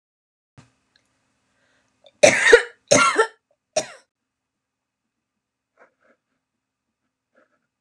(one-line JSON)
{"three_cough_length": "7.8 s", "three_cough_amplitude": 32768, "three_cough_signal_mean_std_ratio": 0.23, "survey_phase": "beta (2021-08-13 to 2022-03-07)", "age": "45-64", "gender": "Female", "wearing_mask": "No", "symptom_sore_throat": true, "symptom_fatigue": true, "symptom_headache": true, "symptom_onset": "13 days", "smoker_status": "Never smoked", "respiratory_condition_asthma": false, "respiratory_condition_other": false, "recruitment_source": "REACT", "submission_delay": "1 day", "covid_test_result": "Negative", "covid_test_method": "RT-qPCR"}